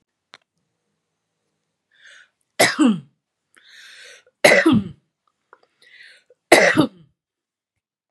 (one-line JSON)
{"three_cough_length": "8.1 s", "three_cough_amplitude": 32768, "three_cough_signal_mean_std_ratio": 0.29, "survey_phase": "beta (2021-08-13 to 2022-03-07)", "age": "65+", "gender": "Female", "wearing_mask": "No", "symptom_none": true, "smoker_status": "Never smoked", "respiratory_condition_asthma": false, "respiratory_condition_other": false, "recruitment_source": "REACT", "submission_delay": "2 days", "covid_test_result": "Negative", "covid_test_method": "RT-qPCR", "influenza_a_test_result": "Negative", "influenza_b_test_result": "Negative"}